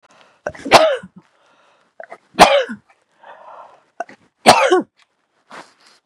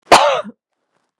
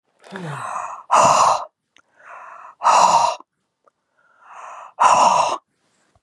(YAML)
three_cough_length: 6.1 s
three_cough_amplitude: 32768
three_cough_signal_mean_std_ratio: 0.31
cough_length: 1.2 s
cough_amplitude: 32768
cough_signal_mean_std_ratio: 0.38
exhalation_length: 6.2 s
exhalation_amplitude: 30973
exhalation_signal_mean_std_ratio: 0.48
survey_phase: beta (2021-08-13 to 2022-03-07)
age: 18-44
gender: Female
wearing_mask: 'No'
symptom_none: true
smoker_status: Ex-smoker
respiratory_condition_asthma: true
respiratory_condition_other: false
recruitment_source: REACT
submission_delay: 2 days
covid_test_result: Negative
covid_test_method: RT-qPCR
influenza_a_test_result: Negative
influenza_b_test_result: Negative